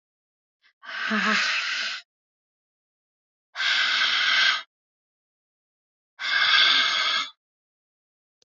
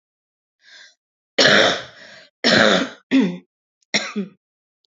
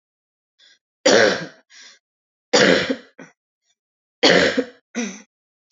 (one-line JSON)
{"exhalation_length": "8.4 s", "exhalation_amplitude": 17541, "exhalation_signal_mean_std_ratio": 0.52, "cough_length": "4.9 s", "cough_amplitude": 29524, "cough_signal_mean_std_ratio": 0.42, "three_cough_length": "5.7 s", "three_cough_amplitude": 28241, "three_cough_signal_mean_std_ratio": 0.37, "survey_phase": "alpha (2021-03-01 to 2021-08-12)", "age": "45-64", "gender": "Female", "wearing_mask": "No", "symptom_cough_any": true, "symptom_fatigue": true, "symptom_fever_high_temperature": true, "symptom_headache": true, "smoker_status": "Current smoker (11 or more cigarettes per day)", "respiratory_condition_asthma": false, "respiratory_condition_other": false, "recruitment_source": "Test and Trace", "submission_delay": "2 days", "covid_test_result": "Positive", "covid_test_method": "RT-qPCR", "covid_ct_value": 36.2, "covid_ct_gene": "ORF1ab gene"}